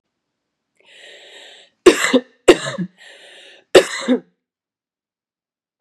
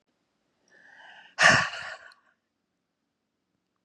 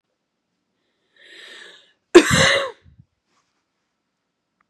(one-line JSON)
{"three_cough_length": "5.8 s", "three_cough_amplitude": 32768, "three_cough_signal_mean_std_ratio": 0.26, "exhalation_length": "3.8 s", "exhalation_amplitude": 19368, "exhalation_signal_mean_std_ratio": 0.24, "cough_length": "4.7 s", "cough_amplitude": 32768, "cough_signal_mean_std_ratio": 0.23, "survey_phase": "beta (2021-08-13 to 2022-03-07)", "age": "18-44", "gender": "Female", "wearing_mask": "No", "symptom_cough_any": true, "symptom_runny_or_blocked_nose": true, "symptom_diarrhoea": true, "symptom_onset": "12 days", "smoker_status": "Never smoked", "respiratory_condition_asthma": true, "respiratory_condition_other": false, "recruitment_source": "Test and Trace", "submission_delay": "2 days", "covid_test_result": "Positive", "covid_test_method": "RT-qPCR", "covid_ct_value": 22.4, "covid_ct_gene": "N gene", "covid_ct_mean": 22.5, "covid_viral_load": "42000 copies/ml", "covid_viral_load_category": "Low viral load (10K-1M copies/ml)"}